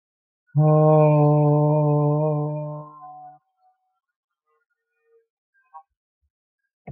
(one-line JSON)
{"exhalation_length": "6.9 s", "exhalation_amplitude": 15219, "exhalation_signal_mean_std_ratio": 0.52, "survey_phase": "beta (2021-08-13 to 2022-03-07)", "age": "45-64", "gender": "Male", "wearing_mask": "No", "symptom_none": true, "smoker_status": "Ex-smoker", "respiratory_condition_asthma": false, "respiratory_condition_other": false, "recruitment_source": "REACT", "submission_delay": "4 days", "covid_test_result": "Negative", "covid_test_method": "RT-qPCR"}